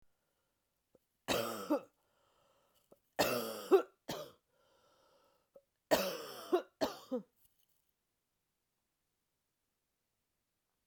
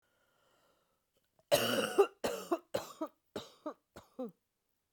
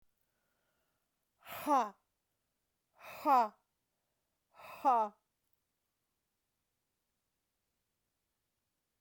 {"three_cough_length": "10.9 s", "three_cough_amplitude": 5747, "three_cough_signal_mean_std_ratio": 0.28, "cough_length": "4.9 s", "cough_amplitude": 5954, "cough_signal_mean_std_ratio": 0.34, "exhalation_length": "9.0 s", "exhalation_amplitude": 4199, "exhalation_signal_mean_std_ratio": 0.24, "survey_phase": "alpha (2021-03-01 to 2021-08-12)", "age": "45-64", "gender": "Female", "wearing_mask": "No", "symptom_cough_any": true, "symptom_new_continuous_cough": true, "symptom_fatigue": true, "symptom_change_to_sense_of_smell_or_taste": true, "symptom_loss_of_taste": true, "symptom_onset": "4 days", "smoker_status": "Never smoked", "respiratory_condition_asthma": false, "respiratory_condition_other": false, "recruitment_source": "Test and Trace", "submission_delay": "1 day", "covid_test_result": "Positive", "covid_test_method": "RT-qPCR", "covid_ct_value": 16.5, "covid_ct_gene": "ORF1ab gene", "covid_ct_mean": 17.9, "covid_viral_load": "1400000 copies/ml", "covid_viral_load_category": "High viral load (>1M copies/ml)"}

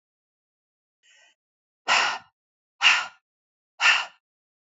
{"exhalation_length": "4.8 s", "exhalation_amplitude": 18901, "exhalation_signal_mean_std_ratio": 0.3, "survey_phase": "beta (2021-08-13 to 2022-03-07)", "age": "45-64", "gender": "Female", "wearing_mask": "No", "symptom_cough_any": true, "smoker_status": "Never smoked", "respiratory_condition_asthma": false, "respiratory_condition_other": false, "recruitment_source": "REACT", "submission_delay": "3 days", "covid_test_result": "Negative", "covid_test_method": "RT-qPCR"}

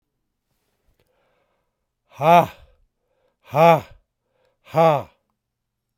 {"exhalation_length": "6.0 s", "exhalation_amplitude": 26656, "exhalation_signal_mean_std_ratio": 0.27, "survey_phase": "alpha (2021-03-01 to 2021-08-12)", "age": "65+", "gender": "Male", "wearing_mask": "No", "symptom_cough_any": true, "symptom_fatigue": true, "symptom_onset": "4 days", "smoker_status": "Ex-smoker", "respiratory_condition_asthma": false, "respiratory_condition_other": false, "recruitment_source": "Test and Trace", "submission_delay": "2 days", "covid_test_result": "Positive", "covid_test_method": "RT-qPCR", "covid_ct_value": 19.0, "covid_ct_gene": "ORF1ab gene"}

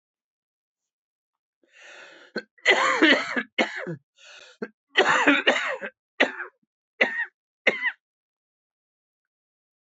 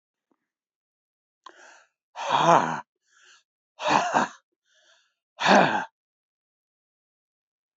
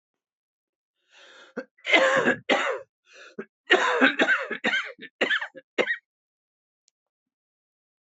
{"three_cough_length": "9.8 s", "three_cough_amplitude": 19793, "three_cough_signal_mean_std_ratio": 0.37, "exhalation_length": "7.8 s", "exhalation_amplitude": 20278, "exhalation_signal_mean_std_ratio": 0.31, "cough_length": "8.0 s", "cough_amplitude": 20390, "cough_signal_mean_std_ratio": 0.41, "survey_phase": "beta (2021-08-13 to 2022-03-07)", "age": "65+", "gender": "Male", "wearing_mask": "No", "symptom_cough_any": true, "symptom_new_continuous_cough": true, "symptom_runny_or_blocked_nose": true, "symptom_shortness_of_breath": true, "symptom_fatigue": true, "symptom_fever_high_temperature": true, "symptom_headache": true, "symptom_change_to_sense_of_smell_or_taste": true, "symptom_loss_of_taste": true, "symptom_other": true, "smoker_status": "Never smoked", "respiratory_condition_asthma": false, "respiratory_condition_other": false, "recruitment_source": "Test and Trace", "submission_delay": "2 days", "covid_test_result": "Positive", "covid_test_method": "RT-qPCR", "covid_ct_value": 16.6, "covid_ct_gene": "ORF1ab gene"}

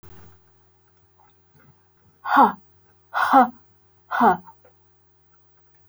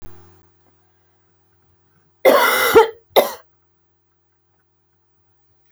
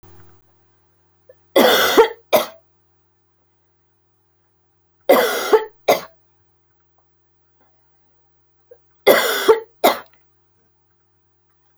{"exhalation_length": "5.9 s", "exhalation_amplitude": 25408, "exhalation_signal_mean_std_ratio": 0.3, "cough_length": "5.7 s", "cough_amplitude": 29326, "cough_signal_mean_std_ratio": 0.29, "three_cough_length": "11.8 s", "three_cough_amplitude": 32768, "three_cough_signal_mean_std_ratio": 0.31, "survey_phase": "beta (2021-08-13 to 2022-03-07)", "age": "45-64", "gender": "Female", "wearing_mask": "No", "symptom_cough_any": true, "smoker_status": "Never smoked", "respiratory_condition_asthma": false, "respiratory_condition_other": false, "recruitment_source": "Test and Trace", "submission_delay": "1 day", "covid_test_result": "Positive", "covid_test_method": "RT-qPCR", "covid_ct_value": 27.5, "covid_ct_gene": "ORF1ab gene", "covid_ct_mean": 28.2, "covid_viral_load": "560 copies/ml", "covid_viral_load_category": "Minimal viral load (< 10K copies/ml)"}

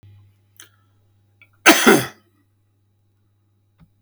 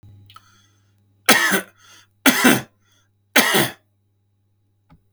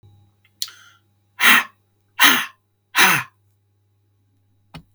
{"cough_length": "4.0 s", "cough_amplitude": 32768, "cough_signal_mean_std_ratio": 0.24, "three_cough_length": "5.1 s", "three_cough_amplitude": 32768, "three_cough_signal_mean_std_ratio": 0.34, "exhalation_length": "4.9 s", "exhalation_amplitude": 32768, "exhalation_signal_mean_std_ratio": 0.31, "survey_phase": "beta (2021-08-13 to 2022-03-07)", "age": "45-64", "gender": "Male", "wearing_mask": "No", "symptom_cough_any": true, "smoker_status": "Ex-smoker", "respiratory_condition_asthma": false, "respiratory_condition_other": false, "recruitment_source": "REACT", "submission_delay": "3 days", "covid_test_result": "Negative", "covid_test_method": "RT-qPCR", "influenza_a_test_result": "Negative", "influenza_b_test_result": "Negative"}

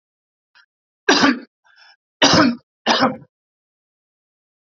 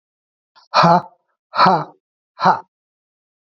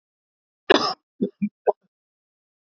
{"three_cough_length": "4.7 s", "three_cough_amplitude": 29635, "three_cough_signal_mean_std_ratio": 0.35, "exhalation_length": "3.6 s", "exhalation_amplitude": 30178, "exhalation_signal_mean_std_ratio": 0.35, "cough_length": "2.7 s", "cough_amplitude": 27947, "cough_signal_mean_std_ratio": 0.25, "survey_phase": "beta (2021-08-13 to 2022-03-07)", "age": "45-64", "gender": "Male", "wearing_mask": "No", "symptom_cough_any": true, "symptom_runny_or_blocked_nose": true, "symptom_sore_throat": true, "symptom_fatigue": true, "symptom_headache": true, "smoker_status": "Never smoked", "respiratory_condition_asthma": false, "respiratory_condition_other": false, "recruitment_source": "Test and Trace", "submission_delay": "1 day", "covid_test_result": "Positive", "covid_test_method": "RT-qPCR", "covid_ct_value": 22.8, "covid_ct_gene": "ORF1ab gene", "covid_ct_mean": 24.5, "covid_viral_load": "9000 copies/ml", "covid_viral_load_category": "Minimal viral load (< 10K copies/ml)"}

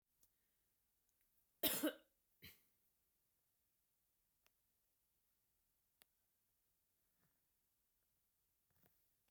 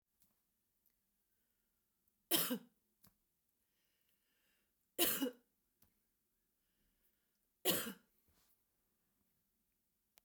{"cough_length": "9.3 s", "cough_amplitude": 2142, "cough_signal_mean_std_ratio": 0.16, "three_cough_length": "10.2 s", "three_cough_amplitude": 3677, "three_cough_signal_mean_std_ratio": 0.23, "survey_phase": "beta (2021-08-13 to 2022-03-07)", "age": "45-64", "gender": "Female", "wearing_mask": "No", "symptom_none": true, "smoker_status": "Never smoked", "respiratory_condition_asthma": false, "respiratory_condition_other": false, "recruitment_source": "REACT", "submission_delay": "0 days", "covid_test_result": "Negative", "covid_test_method": "RT-qPCR", "influenza_a_test_result": "Negative", "influenza_b_test_result": "Negative"}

